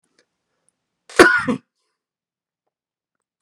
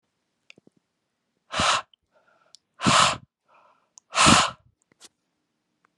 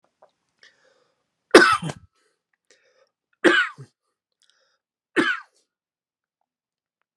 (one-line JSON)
{"cough_length": "3.4 s", "cough_amplitude": 32768, "cough_signal_mean_std_ratio": 0.22, "exhalation_length": "6.0 s", "exhalation_amplitude": 24102, "exhalation_signal_mean_std_ratio": 0.31, "three_cough_length": "7.2 s", "three_cough_amplitude": 32768, "three_cough_signal_mean_std_ratio": 0.22, "survey_phase": "beta (2021-08-13 to 2022-03-07)", "age": "18-44", "gender": "Male", "wearing_mask": "No", "symptom_none": true, "smoker_status": "Never smoked", "respiratory_condition_asthma": false, "respiratory_condition_other": false, "recruitment_source": "REACT", "submission_delay": "1 day", "covid_test_result": "Positive", "covid_test_method": "RT-qPCR", "covid_ct_value": 30.9, "covid_ct_gene": "E gene", "influenza_a_test_result": "Negative", "influenza_b_test_result": "Negative"}